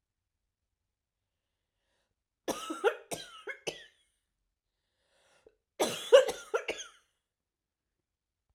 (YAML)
cough_length: 8.5 s
cough_amplitude: 13270
cough_signal_mean_std_ratio: 0.22
survey_phase: beta (2021-08-13 to 2022-03-07)
age: 45-64
gender: Female
wearing_mask: 'No'
symptom_cough_any: true
symptom_runny_or_blocked_nose: true
symptom_fatigue: true
symptom_fever_high_temperature: true
symptom_headache: true
symptom_change_to_sense_of_smell_or_taste: true
symptom_loss_of_taste: true
symptom_onset: 3 days
smoker_status: Never smoked
respiratory_condition_asthma: false
respiratory_condition_other: false
recruitment_source: Test and Trace
submission_delay: 2 days
covid_test_result: Positive
covid_test_method: RT-qPCR
covid_ct_value: 21.1
covid_ct_gene: N gene